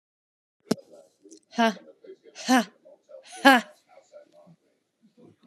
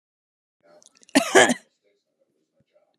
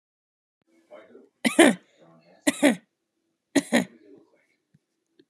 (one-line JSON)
{"exhalation_length": "5.5 s", "exhalation_amplitude": 27360, "exhalation_signal_mean_std_ratio": 0.25, "cough_length": "3.0 s", "cough_amplitude": 31353, "cough_signal_mean_std_ratio": 0.24, "three_cough_length": "5.3 s", "three_cough_amplitude": 26035, "three_cough_signal_mean_std_ratio": 0.25, "survey_phase": "beta (2021-08-13 to 2022-03-07)", "age": "18-44", "gender": "Female", "wearing_mask": "No", "symptom_none": true, "smoker_status": "Never smoked", "respiratory_condition_asthma": false, "respiratory_condition_other": false, "recruitment_source": "REACT", "submission_delay": "2 days", "covid_test_result": "Negative", "covid_test_method": "RT-qPCR", "influenza_a_test_result": "Negative", "influenza_b_test_result": "Negative"}